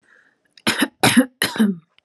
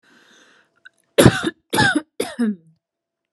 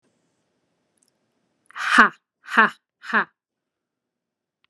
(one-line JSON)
{"cough_length": "2.0 s", "cough_amplitude": 30465, "cough_signal_mean_std_ratio": 0.45, "three_cough_length": "3.3 s", "three_cough_amplitude": 32768, "three_cough_signal_mean_std_ratio": 0.35, "exhalation_length": "4.7 s", "exhalation_amplitude": 32767, "exhalation_signal_mean_std_ratio": 0.24, "survey_phase": "alpha (2021-03-01 to 2021-08-12)", "age": "18-44", "gender": "Female", "wearing_mask": "No", "symptom_none": true, "smoker_status": "Never smoked", "respiratory_condition_asthma": false, "respiratory_condition_other": false, "recruitment_source": "REACT", "submission_delay": "1 day", "covid_test_result": "Negative", "covid_test_method": "RT-qPCR"}